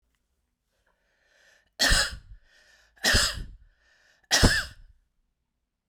{"three_cough_length": "5.9 s", "three_cough_amplitude": 18746, "three_cough_signal_mean_std_ratio": 0.33, "survey_phase": "beta (2021-08-13 to 2022-03-07)", "age": "45-64", "gender": "Female", "wearing_mask": "No", "symptom_runny_or_blocked_nose": true, "symptom_onset": "9 days", "smoker_status": "Never smoked", "respiratory_condition_asthma": false, "respiratory_condition_other": false, "recruitment_source": "REACT", "submission_delay": "2 days", "covid_test_result": "Negative", "covid_test_method": "RT-qPCR"}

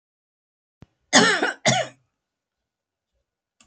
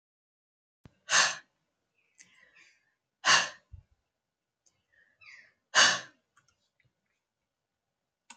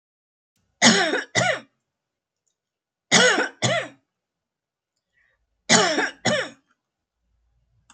{"cough_length": "3.7 s", "cough_amplitude": 27322, "cough_signal_mean_std_ratio": 0.3, "exhalation_length": "8.4 s", "exhalation_amplitude": 15138, "exhalation_signal_mean_std_ratio": 0.23, "three_cough_length": "7.9 s", "three_cough_amplitude": 32767, "three_cough_signal_mean_std_ratio": 0.37, "survey_phase": "alpha (2021-03-01 to 2021-08-12)", "age": "65+", "gender": "Female", "wearing_mask": "No", "symptom_none": true, "smoker_status": "Ex-smoker", "respiratory_condition_asthma": false, "respiratory_condition_other": false, "recruitment_source": "REACT", "submission_delay": "1 day", "covid_test_result": "Negative", "covid_test_method": "RT-qPCR"}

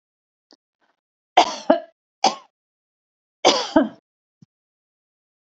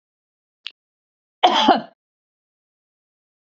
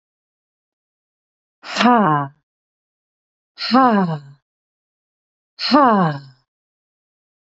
{"three_cough_length": "5.5 s", "three_cough_amplitude": 32768, "three_cough_signal_mean_std_ratio": 0.25, "cough_length": "3.4 s", "cough_amplitude": 27811, "cough_signal_mean_std_ratio": 0.25, "exhalation_length": "7.4 s", "exhalation_amplitude": 28503, "exhalation_signal_mean_std_ratio": 0.36, "survey_phase": "beta (2021-08-13 to 2022-03-07)", "age": "45-64", "gender": "Female", "wearing_mask": "No", "symptom_none": true, "symptom_onset": "6 days", "smoker_status": "Never smoked", "respiratory_condition_asthma": false, "respiratory_condition_other": false, "recruitment_source": "REACT", "submission_delay": "3 days", "covid_test_result": "Negative", "covid_test_method": "RT-qPCR", "influenza_a_test_result": "Negative", "influenza_b_test_result": "Negative"}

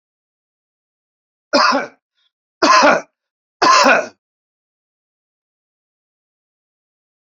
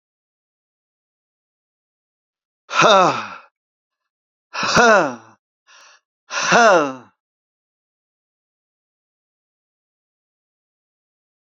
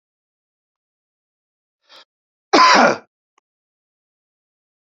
{"three_cough_length": "7.3 s", "three_cough_amplitude": 31927, "three_cough_signal_mean_std_ratio": 0.32, "exhalation_length": "11.5 s", "exhalation_amplitude": 29546, "exhalation_signal_mean_std_ratio": 0.28, "cough_length": "4.9 s", "cough_amplitude": 29089, "cough_signal_mean_std_ratio": 0.24, "survey_phase": "beta (2021-08-13 to 2022-03-07)", "age": "45-64", "gender": "Male", "wearing_mask": "No", "symptom_cough_any": true, "symptom_runny_or_blocked_nose": true, "symptom_onset": "4 days", "smoker_status": "Never smoked", "respiratory_condition_asthma": false, "respiratory_condition_other": false, "recruitment_source": "Test and Trace", "submission_delay": "1 day", "covid_test_result": "Positive", "covid_test_method": "ePCR"}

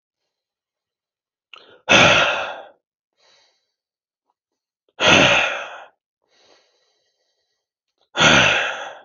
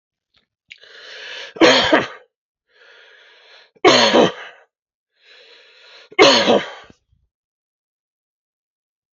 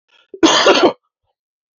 {"exhalation_length": "9.0 s", "exhalation_amplitude": 31329, "exhalation_signal_mean_std_ratio": 0.35, "three_cough_length": "9.1 s", "three_cough_amplitude": 31415, "three_cough_signal_mean_std_ratio": 0.32, "cough_length": "1.8 s", "cough_amplitude": 31181, "cough_signal_mean_std_ratio": 0.44, "survey_phase": "beta (2021-08-13 to 2022-03-07)", "age": "45-64", "gender": "Male", "wearing_mask": "No", "symptom_cough_any": true, "symptom_runny_or_blocked_nose": true, "symptom_sore_throat": true, "symptom_abdominal_pain": true, "symptom_diarrhoea": true, "symptom_fever_high_temperature": true, "symptom_headache": true, "symptom_change_to_sense_of_smell_or_taste": true, "symptom_onset": "2 days", "smoker_status": "Never smoked", "respiratory_condition_asthma": false, "respiratory_condition_other": false, "recruitment_source": "Test and Trace", "submission_delay": "1 day", "covid_test_result": "Positive", "covid_test_method": "RT-qPCR", "covid_ct_value": 29.4, "covid_ct_gene": "N gene"}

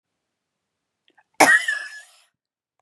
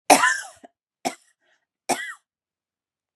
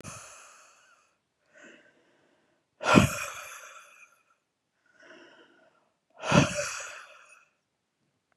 {"cough_length": "2.8 s", "cough_amplitude": 32767, "cough_signal_mean_std_ratio": 0.27, "three_cough_length": "3.2 s", "three_cough_amplitude": 32767, "three_cough_signal_mean_std_ratio": 0.27, "exhalation_length": "8.4 s", "exhalation_amplitude": 22693, "exhalation_signal_mean_std_ratio": 0.26, "survey_phase": "beta (2021-08-13 to 2022-03-07)", "age": "18-44", "gender": "Female", "wearing_mask": "No", "symptom_none": true, "symptom_onset": "12 days", "smoker_status": "Ex-smoker", "respiratory_condition_asthma": false, "respiratory_condition_other": false, "recruitment_source": "REACT", "submission_delay": "1 day", "covid_test_result": "Negative", "covid_test_method": "RT-qPCR", "influenza_a_test_result": "Unknown/Void", "influenza_b_test_result": "Unknown/Void"}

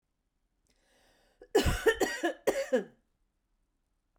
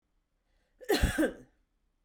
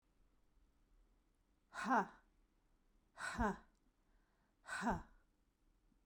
{"three_cough_length": "4.2 s", "three_cough_amplitude": 8911, "three_cough_signal_mean_std_ratio": 0.36, "cough_length": "2.0 s", "cough_amplitude": 6478, "cough_signal_mean_std_ratio": 0.36, "exhalation_length": "6.1 s", "exhalation_amplitude": 2035, "exhalation_signal_mean_std_ratio": 0.32, "survey_phase": "beta (2021-08-13 to 2022-03-07)", "age": "45-64", "gender": "Female", "wearing_mask": "No", "symptom_cough_any": true, "symptom_fatigue": true, "symptom_headache": true, "symptom_onset": "12 days", "smoker_status": "Ex-smoker", "respiratory_condition_asthma": false, "respiratory_condition_other": false, "recruitment_source": "REACT", "submission_delay": "1 day", "covid_test_result": "Negative", "covid_test_method": "RT-qPCR"}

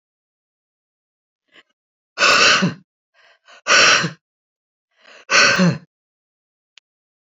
{"exhalation_length": "7.3 s", "exhalation_amplitude": 31046, "exhalation_signal_mean_std_ratio": 0.36, "survey_phase": "beta (2021-08-13 to 2022-03-07)", "age": "65+", "gender": "Female", "wearing_mask": "No", "symptom_runny_or_blocked_nose": true, "smoker_status": "Never smoked", "respiratory_condition_asthma": false, "respiratory_condition_other": false, "recruitment_source": "REACT", "submission_delay": "2 days", "covid_test_result": "Negative", "covid_test_method": "RT-qPCR", "influenza_a_test_result": "Negative", "influenza_b_test_result": "Negative"}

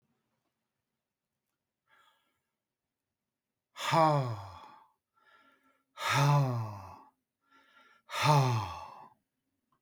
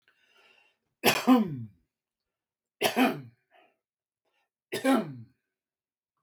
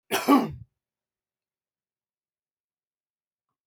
{"exhalation_length": "9.8 s", "exhalation_amplitude": 8618, "exhalation_signal_mean_std_ratio": 0.35, "three_cough_length": "6.2 s", "three_cough_amplitude": 13420, "three_cough_signal_mean_std_ratio": 0.32, "cough_length": "3.7 s", "cough_amplitude": 14875, "cough_signal_mean_std_ratio": 0.22, "survey_phase": "beta (2021-08-13 to 2022-03-07)", "age": "65+", "gender": "Male", "wearing_mask": "No", "symptom_none": true, "smoker_status": "Never smoked", "respiratory_condition_asthma": true, "respiratory_condition_other": false, "recruitment_source": "REACT", "submission_delay": "3 days", "covid_test_result": "Negative", "covid_test_method": "RT-qPCR", "influenza_a_test_result": "Negative", "influenza_b_test_result": "Negative"}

